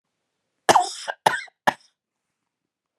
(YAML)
cough_length: 3.0 s
cough_amplitude: 28725
cough_signal_mean_std_ratio: 0.25
survey_phase: alpha (2021-03-01 to 2021-08-12)
age: 45-64
gender: Female
wearing_mask: 'No'
symptom_none: true
smoker_status: Never smoked
respiratory_condition_asthma: false
respiratory_condition_other: false
recruitment_source: REACT
submission_delay: 1 day
covid_test_result: Negative
covid_test_method: RT-qPCR